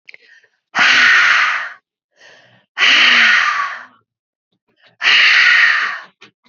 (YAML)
exhalation_length: 6.5 s
exhalation_amplitude: 32768
exhalation_signal_mean_std_ratio: 0.59
survey_phase: beta (2021-08-13 to 2022-03-07)
age: 18-44
gender: Female
wearing_mask: 'No'
symptom_cough_any: true
symptom_runny_or_blocked_nose: true
symptom_sore_throat: true
symptom_onset: 6 days
smoker_status: Never smoked
respiratory_condition_asthma: false
respiratory_condition_other: false
recruitment_source: Test and Trace
submission_delay: 2 days
covid_test_result: Positive
covid_test_method: RT-qPCR
covid_ct_value: 25.0
covid_ct_gene: N gene